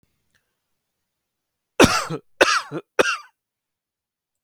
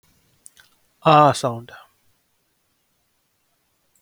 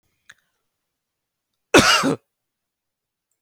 {"three_cough_length": "4.4 s", "three_cough_amplitude": 32768, "three_cough_signal_mean_std_ratio": 0.28, "exhalation_length": "4.0 s", "exhalation_amplitude": 30250, "exhalation_signal_mean_std_ratio": 0.26, "cough_length": "3.4 s", "cough_amplitude": 30494, "cough_signal_mean_std_ratio": 0.26, "survey_phase": "alpha (2021-03-01 to 2021-08-12)", "age": "18-44", "gender": "Male", "wearing_mask": "No", "symptom_none": true, "smoker_status": "Ex-smoker", "respiratory_condition_asthma": false, "respiratory_condition_other": false, "recruitment_source": "REACT", "submission_delay": "1 day", "covid_test_result": "Negative", "covid_test_method": "RT-qPCR"}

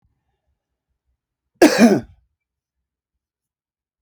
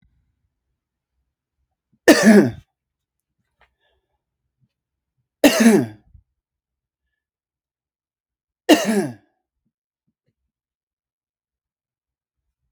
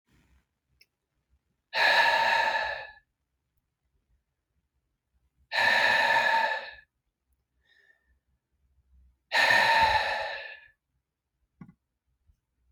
{"cough_length": "4.0 s", "cough_amplitude": 32495, "cough_signal_mean_std_ratio": 0.23, "three_cough_length": "12.7 s", "three_cough_amplitude": 32495, "three_cough_signal_mean_std_ratio": 0.23, "exhalation_length": "12.7 s", "exhalation_amplitude": 9834, "exhalation_signal_mean_std_ratio": 0.42, "survey_phase": "beta (2021-08-13 to 2022-03-07)", "age": "18-44", "gender": "Male", "wearing_mask": "No", "symptom_runny_or_blocked_nose": true, "symptom_sore_throat": true, "smoker_status": "Never smoked", "respiratory_condition_asthma": false, "respiratory_condition_other": false, "recruitment_source": "REACT", "submission_delay": "2 days", "covid_test_result": "Negative", "covid_test_method": "RT-qPCR", "influenza_a_test_result": "Negative", "influenza_b_test_result": "Negative"}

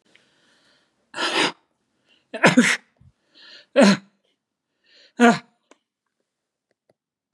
{"three_cough_length": "7.3 s", "three_cough_amplitude": 30524, "three_cough_signal_mean_std_ratio": 0.28, "survey_phase": "beta (2021-08-13 to 2022-03-07)", "age": "65+", "gender": "Male", "wearing_mask": "No", "symptom_none": true, "smoker_status": "Never smoked", "respiratory_condition_asthma": false, "respiratory_condition_other": false, "recruitment_source": "REACT", "submission_delay": "2 days", "covid_test_result": "Negative", "covid_test_method": "RT-qPCR", "influenza_a_test_result": "Negative", "influenza_b_test_result": "Negative"}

